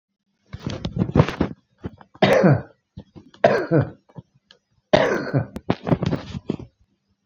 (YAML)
three_cough_length: 7.3 s
three_cough_amplitude: 28707
three_cough_signal_mean_std_ratio: 0.42
survey_phase: beta (2021-08-13 to 2022-03-07)
age: 65+
gender: Male
wearing_mask: 'No'
symptom_runny_or_blocked_nose: true
symptom_onset: 12 days
smoker_status: Current smoker (1 to 10 cigarettes per day)
respiratory_condition_asthma: false
respiratory_condition_other: false
recruitment_source: REACT
submission_delay: 2 days
covid_test_result: Negative
covid_test_method: RT-qPCR